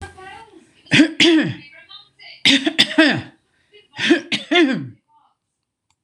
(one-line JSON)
{"three_cough_length": "6.0 s", "three_cough_amplitude": 26028, "three_cough_signal_mean_std_ratio": 0.45, "survey_phase": "beta (2021-08-13 to 2022-03-07)", "age": "65+", "gender": "Female", "wearing_mask": "No", "symptom_fatigue": true, "symptom_onset": "8 days", "smoker_status": "Ex-smoker", "respiratory_condition_asthma": false, "respiratory_condition_other": false, "recruitment_source": "REACT", "submission_delay": "2 days", "covid_test_result": "Negative", "covid_test_method": "RT-qPCR", "influenza_a_test_result": "Unknown/Void", "influenza_b_test_result": "Unknown/Void"}